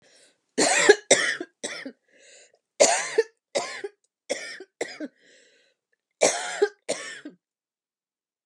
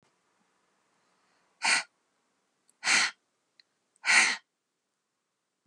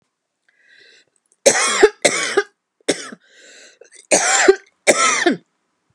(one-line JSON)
{"three_cough_length": "8.5 s", "three_cough_amplitude": 30254, "three_cough_signal_mean_std_ratio": 0.35, "exhalation_length": "5.7 s", "exhalation_amplitude": 13295, "exhalation_signal_mean_std_ratio": 0.28, "cough_length": "5.9 s", "cough_amplitude": 32768, "cough_signal_mean_std_ratio": 0.41, "survey_phase": "beta (2021-08-13 to 2022-03-07)", "age": "65+", "gender": "Female", "wearing_mask": "No", "symptom_none": true, "smoker_status": "Never smoked", "respiratory_condition_asthma": false, "respiratory_condition_other": false, "recruitment_source": "REACT", "submission_delay": "2 days", "covid_test_result": "Negative", "covid_test_method": "RT-qPCR", "influenza_a_test_result": "Negative", "influenza_b_test_result": "Negative"}